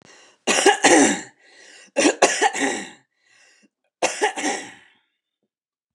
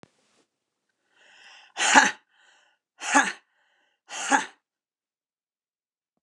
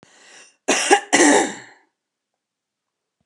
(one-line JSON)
{"three_cough_length": "5.9 s", "three_cough_amplitude": 29203, "three_cough_signal_mean_std_ratio": 0.43, "exhalation_length": "6.2 s", "exhalation_amplitude": 29203, "exhalation_signal_mean_std_ratio": 0.26, "cough_length": "3.3 s", "cough_amplitude": 29203, "cough_signal_mean_std_ratio": 0.37, "survey_phase": "beta (2021-08-13 to 2022-03-07)", "age": "45-64", "gender": "Female", "wearing_mask": "No", "symptom_none": true, "smoker_status": "Ex-smoker", "respiratory_condition_asthma": false, "respiratory_condition_other": false, "recruitment_source": "REACT", "submission_delay": "12 days", "covid_test_result": "Negative", "covid_test_method": "RT-qPCR"}